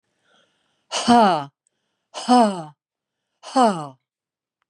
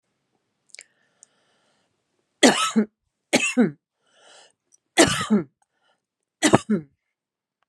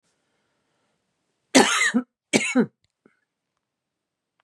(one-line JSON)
{"exhalation_length": "4.7 s", "exhalation_amplitude": 27470, "exhalation_signal_mean_std_ratio": 0.37, "three_cough_length": "7.7 s", "three_cough_amplitude": 32752, "three_cough_signal_mean_std_ratio": 0.31, "cough_length": "4.4 s", "cough_amplitude": 28001, "cough_signal_mean_std_ratio": 0.3, "survey_phase": "beta (2021-08-13 to 2022-03-07)", "age": "65+", "gender": "Female", "wearing_mask": "No", "symptom_cough_any": true, "symptom_shortness_of_breath": true, "symptom_fatigue": true, "symptom_onset": "8 days", "smoker_status": "Ex-smoker", "respiratory_condition_asthma": false, "respiratory_condition_other": false, "recruitment_source": "REACT", "submission_delay": "2 days", "covid_test_result": "Negative", "covid_test_method": "RT-qPCR", "influenza_a_test_result": "Negative", "influenza_b_test_result": "Negative"}